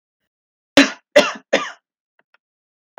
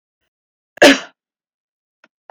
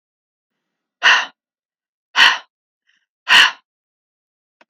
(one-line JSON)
{"three_cough_length": "3.0 s", "three_cough_amplitude": 32768, "three_cough_signal_mean_std_ratio": 0.26, "cough_length": "2.3 s", "cough_amplitude": 32768, "cough_signal_mean_std_ratio": 0.22, "exhalation_length": "4.7 s", "exhalation_amplitude": 32768, "exhalation_signal_mean_std_ratio": 0.28, "survey_phase": "beta (2021-08-13 to 2022-03-07)", "age": "18-44", "gender": "Female", "wearing_mask": "No", "symptom_none": true, "smoker_status": "Never smoked", "respiratory_condition_asthma": false, "respiratory_condition_other": false, "recruitment_source": "REACT", "submission_delay": "2 days", "covid_test_result": "Negative", "covid_test_method": "RT-qPCR"}